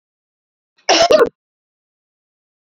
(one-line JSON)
{"cough_length": "2.6 s", "cough_amplitude": 32223, "cough_signal_mean_std_ratio": 0.3, "survey_phase": "beta (2021-08-13 to 2022-03-07)", "age": "45-64", "gender": "Female", "wearing_mask": "No", "symptom_none": true, "smoker_status": "Never smoked", "respiratory_condition_asthma": true, "respiratory_condition_other": false, "recruitment_source": "REACT", "submission_delay": "2 days", "covid_test_result": "Negative", "covid_test_method": "RT-qPCR"}